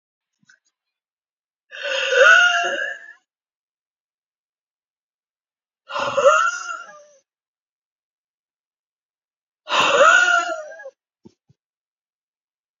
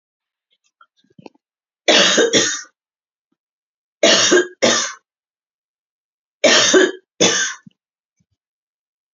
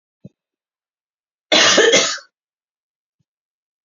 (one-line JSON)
{"exhalation_length": "12.8 s", "exhalation_amplitude": 27604, "exhalation_signal_mean_std_ratio": 0.35, "three_cough_length": "9.1 s", "three_cough_amplitude": 31251, "three_cough_signal_mean_std_ratio": 0.39, "cough_length": "3.8 s", "cough_amplitude": 30510, "cough_signal_mean_std_ratio": 0.33, "survey_phase": "beta (2021-08-13 to 2022-03-07)", "age": "45-64", "gender": "Female", "wearing_mask": "No", "symptom_none": true, "smoker_status": "Current smoker (e-cigarettes or vapes only)", "respiratory_condition_asthma": false, "respiratory_condition_other": false, "recruitment_source": "REACT", "submission_delay": "4 days", "covid_test_result": "Negative", "covid_test_method": "RT-qPCR"}